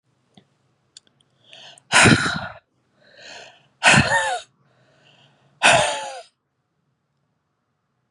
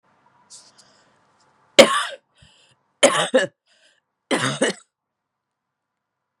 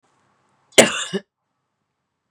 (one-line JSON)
{"exhalation_length": "8.1 s", "exhalation_amplitude": 31021, "exhalation_signal_mean_std_ratio": 0.32, "three_cough_length": "6.4 s", "three_cough_amplitude": 32768, "three_cough_signal_mean_std_ratio": 0.26, "cough_length": "2.3 s", "cough_amplitude": 32768, "cough_signal_mean_std_ratio": 0.22, "survey_phase": "beta (2021-08-13 to 2022-03-07)", "age": "45-64", "gender": "Female", "wearing_mask": "No", "symptom_cough_any": true, "symptom_shortness_of_breath": true, "symptom_sore_throat": true, "symptom_fatigue": true, "symptom_fever_high_temperature": true, "symptom_headache": true, "symptom_change_to_sense_of_smell_or_taste": true, "symptom_onset": "3 days", "smoker_status": "Never smoked", "respiratory_condition_asthma": false, "respiratory_condition_other": false, "recruitment_source": "Test and Trace", "submission_delay": "2 days", "covid_test_result": "Positive", "covid_test_method": "RT-qPCR", "covid_ct_value": 24.9, "covid_ct_gene": "N gene"}